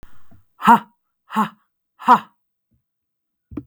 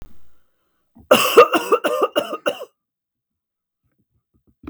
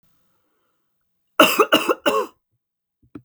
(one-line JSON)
{"exhalation_length": "3.7 s", "exhalation_amplitude": 32766, "exhalation_signal_mean_std_ratio": 0.27, "cough_length": "4.7 s", "cough_amplitude": 32768, "cough_signal_mean_std_ratio": 0.34, "three_cough_length": "3.2 s", "three_cough_amplitude": 32768, "three_cough_signal_mean_std_ratio": 0.32, "survey_phase": "beta (2021-08-13 to 2022-03-07)", "age": "45-64", "gender": "Female", "wearing_mask": "No", "symptom_cough_any": true, "symptom_runny_or_blocked_nose": true, "symptom_shortness_of_breath": true, "symptom_sore_throat": true, "symptom_fatigue": true, "symptom_fever_high_temperature": true, "symptom_headache": true, "symptom_other": true, "smoker_status": "Never smoked", "respiratory_condition_asthma": false, "respiratory_condition_other": false, "recruitment_source": "Test and Trace", "submission_delay": "2 days", "covid_test_result": "Positive", "covid_test_method": "ePCR"}